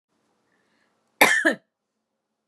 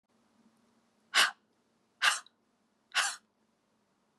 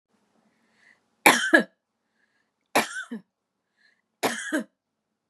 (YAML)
cough_length: 2.5 s
cough_amplitude: 31339
cough_signal_mean_std_ratio: 0.26
exhalation_length: 4.2 s
exhalation_amplitude: 8741
exhalation_signal_mean_std_ratio: 0.26
three_cough_length: 5.3 s
three_cough_amplitude: 30595
three_cough_signal_mean_std_ratio: 0.27
survey_phase: beta (2021-08-13 to 2022-03-07)
age: 45-64
gender: Female
wearing_mask: 'No'
symptom_none: true
smoker_status: Never smoked
respiratory_condition_asthma: false
respiratory_condition_other: false
recruitment_source: REACT
submission_delay: 3 days
covid_test_result: Negative
covid_test_method: RT-qPCR
influenza_a_test_result: Negative
influenza_b_test_result: Negative